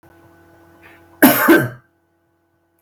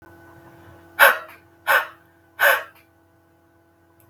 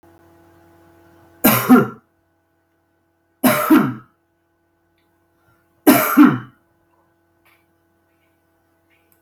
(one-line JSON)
{"cough_length": "2.8 s", "cough_amplitude": 32768, "cough_signal_mean_std_ratio": 0.33, "exhalation_length": "4.1 s", "exhalation_amplitude": 32768, "exhalation_signal_mean_std_ratio": 0.3, "three_cough_length": "9.2 s", "three_cough_amplitude": 32768, "three_cough_signal_mean_std_ratio": 0.3, "survey_phase": "beta (2021-08-13 to 2022-03-07)", "age": "45-64", "gender": "Male", "wearing_mask": "No", "symptom_none": true, "smoker_status": "Never smoked", "respiratory_condition_asthma": false, "respiratory_condition_other": false, "recruitment_source": "REACT", "submission_delay": "0 days", "covid_test_result": "Negative", "covid_test_method": "RT-qPCR"}